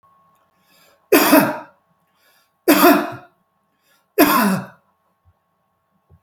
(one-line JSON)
{"three_cough_length": "6.2 s", "three_cough_amplitude": 32768, "three_cough_signal_mean_std_ratio": 0.36, "survey_phase": "beta (2021-08-13 to 2022-03-07)", "age": "65+", "gender": "Male", "wearing_mask": "No", "symptom_none": true, "smoker_status": "Never smoked", "respiratory_condition_asthma": false, "respiratory_condition_other": false, "recruitment_source": "REACT", "submission_delay": "2 days", "covid_test_result": "Negative", "covid_test_method": "RT-qPCR"}